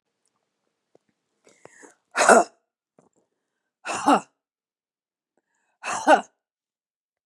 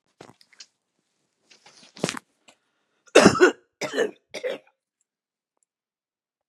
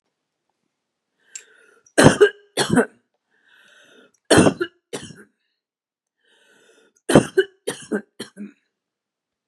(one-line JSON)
{"exhalation_length": "7.3 s", "exhalation_amplitude": 30895, "exhalation_signal_mean_std_ratio": 0.24, "cough_length": "6.5 s", "cough_amplitude": 32766, "cough_signal_mean_std_ratio": 0.23, "three_cough_length": "9.5 s", "three_cough_amplitude": 32768, "three_cough_signal_mean_std_ratio": 0.26, "survey_phase": "beta (2021-08-13 to 2022-03-07)", "age": "65+", "gender": "Female", "wearing_mask": "No", "symptom_none": true, "smoker_status": "Ex-smoker", "respiratory_condition_asthma": true, "respiratory_condition_other": false, "recruitment_source": "Test and Trace", "submission_delay": "3 days", "covid_test_result": "Negative", "covid_test_method": "RT-qPCR"}